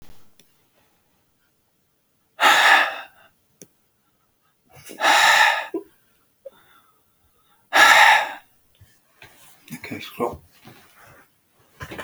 exhalation_length: 12.0 s
exhalation_amplitude: 32768
exhalation_signal_mean_std_ratio: 0.33
survey_phase: beta (2021-08-13 to 2022-03-07)
age: 65+
gender: Male
wearing_mask: 'No'
symptom_none: true
smoker_status: Ex-smoker
respiratory_condition_asthma: false
respiratory_condition_other: false
recruitment_source: REACT
submission_delay: 1 day
covid_test_result: Negative
covid_test_method: RT-qPCR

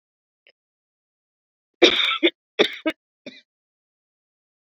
cough_length: 4.8 s
cough_amplitude: 28165
cough_signal_mean_std_ratio: 0.25
survey_phase: beta (2021-08-13 to 2022-03-07)
age: 45-64
gender: Female
wearing_mask: 'No'
symptom_runny_or_blocked_nose: true
symptom_fatigue: true
symptom_fever_high_temperature: true
symptom_headache: true
smoker_status: Never smoked
respiratory_condition_asthma: false
respiratory_condition_other: false
recruitment_source: Test and Trace
submission_delay: 2 days
covid_test_result: Positive
covid_test_method: LFT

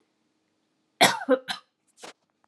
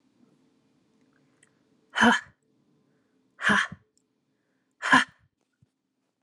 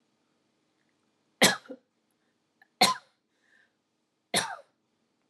cough_length: 2.5 s
cough_amplitude: 23407
cough_signal_mean_std_ratio: 0.27
exhalation_length: 6.2 s
exhalation_amplitude: 16771
exhalation_signal_mean_std_ratio: 0.25
three_cough_length: 5.3 s
three_cough_amplitude: 16939
three_cough_signal_mean_std_ratio: 0.21
survey_phase: alpha (2021-03-01 to 2021-08-12)
age: 18-44
gender: Female
wearing_mask: 'No'
symptom_none: true
smoker_status: Never smoked
respiratory_condition_asthma: false
respiratory_condition_other: false
recruitment_source: REACT
submission_delay: 2 days
covid_test_result: Negative
covid_test_method: RT-qPCR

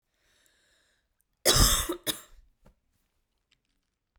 cough_length: 4.2 s
cough_amplitude: 16242
cough_signal_mean_std_ratio: 0.27
survey_phase: beta (2021-08-13 to 2022-03-07)
age: 18-44
gender: Female
wearing_mask: 'No'
symptom_cough_any: true
symptom_runny_or_blocked_nose: true
symptom_sore_throat: true
symptom_fatigue: true
symptom_headache: true
smoker_status: Never smoked
respiratory_condition_asthma: false
respiratory_condition_other: false
recruitment_source: Test and Trace
submission_delay: 2 days
covid_test_result: Positive
covid_test_method: RT-qPCR
covid_ct_value: 16.3
covid_ct_gene: ORF1ab gene
covid_ct_mean: 16.5
covid_viral_load: 3800000 copies/ml
covid_viral_load_category: High viral load (>1M copies/ml)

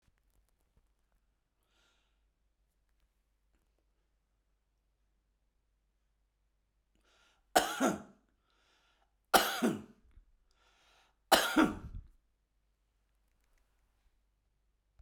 three_cough_length: 15.0 s
three_cough_amplitude: 12239
three_cough_signal_mean_std_ratio: 0.21
survey_phase: beta (2021-08-13 to 2022-03-07)
age: 45-64
gender: Male
wearing_mask: 'No'
symptom_none: true
smoker_status: Ex-smoker
respiratory_condition_asthma: false
respiratory_condition_other: false
recruitment_source: REACT
submission_delay: 2 days
covid_test_result: Negative
covid_test_method: RT-qPCR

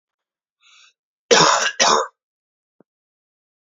cough_length: 3.8 s
cough_amplitude: 32653
cough_signal_mean_std_ratio: 0.33
survey_phase: beta (2021-08-13 to 2022-03-07)
age: 18-44
gender: Male
wearing_mask: 'No'
symptom_cough_any: true
symptom_runny_or_blocked_nose: true
symptom_sore_throat: true
symptom_onset: 3 days
smoker_status: Never smoked
respiratory_condition_asthma: false
respiratory_condition_other: false
recruitment_source: Test and Trace
submission_delay: 1 day
covid_test_result: Positive
covid_test_method: RT-qPCR
covid_ct_value: 30.9
covid_ct_gene: N gene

